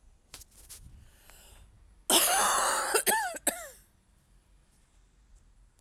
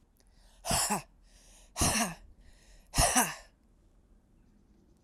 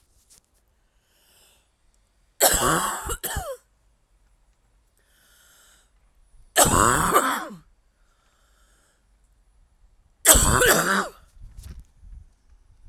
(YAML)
cough_length: 5.8 s
cough_amplitude: 11648
cough_signal_mean_std_ratio: 0.42
exhalation_length: 5.0 s
exhalation_amplitude: 9591
exhalation_signal_mean_std_ratio: 0.39
three_cough_length: 12.9 s
three_cough_amplitude: 32768
three_cough_signal_mean_std_ratio: 0.35
survey_phase: alpha (2021-03-01 to 2021-08-12)
age: 45-64
gender: Female
wearing_mask: 'No'
symptom_new_continuous_cough: true
symptom_shortness_of_breath: true
symptom_fatigue: true
symptom_fever_high_temperature: true
symptom_change_to_sense_of_smell_or_taste: true
symptom_loss_of_taste: true
symptom_onset: 2 days
smoker_status: Ex-smoker
respiratory_condition_asthma: false
respiratory_condition_other: false
recruitment_source: Test and Trace
submission_delay: 2 days
covid_test_result: Positive
covid_test_method: RT-qPCR
covid_ct_value: 16.8
covid_ct_gene: ORF1ab gene
covid_ct_mean: 17.7
covid_viral_load: 1500000 copies/ml
covid_viral_load_category: High viral load (>1M copies/ml)